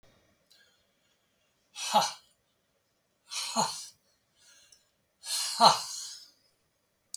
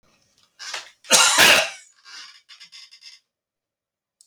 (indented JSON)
{
  "exhalation_length": "7.2 s",
  "exhalation_amplitude": 15882,
  "exhalation_signal_mean_std_ratio": 0.29,
  "cough_length": "4.3 s",
  "cough_amplitude": 32768,
  "cough_signal_mean_std_ratio": 0.3,
  "survey_phase": "beta (2021-08-13 to 2022-03-07)",
  "age": "65+",
  "gender": "Male",
  "wearing_mask": "No",
  "symptom_none": true,
  "smoker_status": "Ex-smoker",
  "respiratory_condition_asthma": false,
  "respiratory_condition_other": false,
  "recruitment_source": "REACT",
  "submission_delay": "0 days",
  "covid_test_result": "Negative",
  "covid_test_method": "RT-qPCR"
}